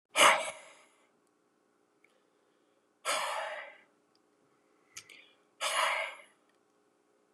{
  "exhalation_length": "7.3 s",
  "exhalation_amplitude": 11228,
  "exhalation_signal_mean_std_ratio": 0.31,
  "survey_phase": "beta (2021-08-13 to 2022-03-07)",
  "age": "65+",
  "gender": "Male",
  "wearing_mask": "No",
  "symptom_cough_any": true,
  "symptom_runny_or_blocked_nose": true,
  "smoker_status": "Ex-smoker",
  "respiratory_condition_asthma": false,
  "respiratory_condition_other": false,
  "recruitment_source": "Test and Trace",
  "submission_delay": "0 days",
  "covid_test_result": "Positive",
  "covid_test_method": "LFT"
}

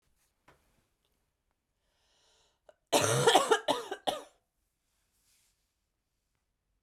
{
  "cough_length": "6.8 s",
  "cough_amplitude": 11696,
  "cough_signal_mean_std_ratio": 0.27,
  "survey_phase": "beta (2021-08-13 to 2022-03-07)",
  "age": "18-44",
  "gender": "Female",
  "wearing_mask": "No",
  "symptom_cough_any": true,
  "symptom_new_continuous_cough": true,
  "symptom_fatigue": true,
  "symptom_fever_high_temperature": true,
  "symptom_change_to_sense_of_smell_or_taste": true,
  "symptom_onset": "5 days",
  "smoker_status": "Never smoked",
  "respiratory_condition_asthma": false,
  "respiratory_condition_other": false,
  "recruitment_source": "Test and Trace",
  "submission_delay": "2 days",
  "covid_test_result": "Positive",
  "covid_test_method": "RT-qPCR"
}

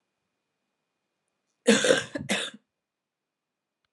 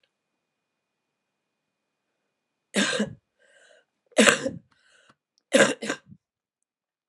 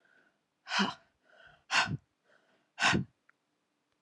{
  "cough_length": "3.9 s",
  "cough_amplitude": 18991,
  "cough_signal_mean_std_ratio": 0.28,
  "three_cough_length": "7.1 s",
  "three_cough_amplitude": 32767,
  "three_cough_signal_mean_std_ratio": 0.25,
  "exhalation_length": "4.0 s",
  "exhalation_amplitude": 7254,
  "exhalation_signal_mean_std_ratio": 0.34,
  "survey_phase": "alpha (2021-03-01 to 2021-08-12)",
  "age": "45-64",
  "gender": "Female",
  "wearing_mask": "No",
  "symptom_cough_any": true,
  "symptom_new_continuous_cough": true,
  "symptom_fatigue": true,
  "symptom_headache": true,
  "smoker_status": "Never smoked",
  "respiratory_condition_asthma": true,
  "respiratory_condition_other": false,
  "recruitment_source": "Test and Trace",
  "submission_delay": "3 days",
  "covid_test_result": "Positive",
  "covid_test_method": "RT-qPCR",
  "covid_ct_value": 37.3,
  "covid_ct_gene": "N gene"
}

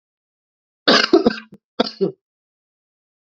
{
  "cough_length": "3.3 s",
  "cough_amplitude": 29992,
  "cough_signal_mean_std_ratio": 0.3,
  "survey_phase": "alpha (2021-03-01 to 2021-08-12)",
  "age": "18-44",
  "gender": "Male",
  "wearing_mask": "No",
  "symptom_cough_any": true,
  "symptom_fatigue": true,
  "symptom_headache": true,
  "symptom_onset": "3 days",
  "smoker_status": "Never smoked",
  "respiratory_condition_asthma": false,
  "respiratory_condition_other": false,
  "recruitment_source": "Test and Trace",
  "submission_delay": "1 day",
  "covid_test_result": "Positive",
  "covid_test_method": "RT-qPCR",
  "covid_ct_value": 18.7,
  "covid_ct_gene": "ORF1ab gene",
  "covid_ct_mean": 19.7,
  "covid_viral_load": "340000 copies/ml",
  "covid_viral_load_category": "Low viral load (10K-1M copies/ml)"
}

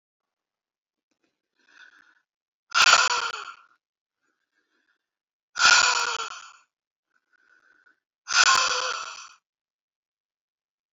{
  "exhalation_length": "10.9 s",
  "exhalation_amplitude": 22979,
  "exhalation_signal_mean_std_ratio": 0.31,
  "survey_phase": "alpha (2021-03-01 to 2021-08-12)",
  "age": "45-64",
  "gender": "Female",
  "wearing_mask": "No",
  "symptom_none": true,
  "smoker_status": "Ex-smoker",
  "respiratory_condition_asthma": false,
  "respiratory_condition_other": false,
  "recruitment_source": "REACT",
  "submission_delay": "2 days",
  "covid_test_result": "Negative",
  "covid_test_method": "RT-qPCR"
}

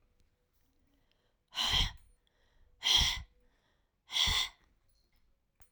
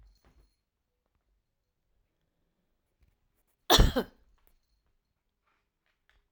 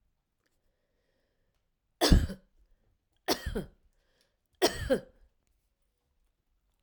{
  "exhalation_length": "5.7 s",
  "exhalation_amplitude": 6715,
  "exhalation_signal_mean_std_ratio": 0.35,
  "cough_length": "6.3 s",
  "cough_amplitude": 21077,
  "cough_signal_mean_std_ratio": 0.16,
  "three_cough_length": "6.8 s",
  "three_cough_amplitude": 12678,
  "three_cough_signal_mean_std_ratio": 0.24,
  "survey_phase": "beta (2021-08-13 to 2022-03-07)",
  "age": "45-64",
  "gender": "Female",
  "wearing_mask": "No",
  "symptom_cough_any": true,
  "symptom_runny_or_blocked_nose": true,
  "symptom_fatigue": true,
  "symptom_loss_of_taste": true,
  "symptom_onset": "3 days",
  "smoker_status": "Never smoked",
  "respiratory_condition_asthma": false,
  "respiratory_condition_other": false,
  "recruitment_source": "Test and Trace",
  "submission_delay": "2 days",
  "covid_test_result": "Positive",
  "covid_test_method": "RT-qPCR",
  "covid_ct_value": 16.9,
  "covid_ct_gene": "N gene"
}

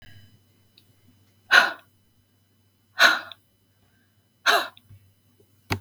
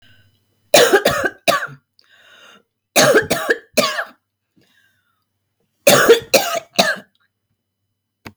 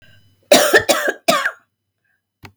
{
  "exhalation_length": "5.8 s",
  "exhalation_amplitude": 32169,
  "exhalation_signal_mean_std_ratio": 0.26,
  "three_cough_length": "8.4 s",
  "three_cough_amplitude": 32768,
  "three_cough_signal_mean_std_ratio": 0.39,
  "cough_length": "2.6 s",
  "cough_amplitude": 32768,
  "cough_signal_mean_std_ratio": 0.41,
  "survey_phase": "beta (2021-08-13 to 2022-03-07)",
  "age": "45-64",
  "gender": "Female",
  "wearing_mask": "No",
  "symptom_none": true,
  "smoker_status": "Never smoked",
  "respiratory_condition_asthma": false,
  "respiratory_condition_other": false,
  "recruitment_source": "REACT",
  "submission_delay": "2 days",
  "covid_test_result": "Negative",
  "covid_test_method": "RT-qPCR",
  "influenza_a_test_result": "Unknown/Void",
  "influenza_b_test_result": "Unknown/Void"
}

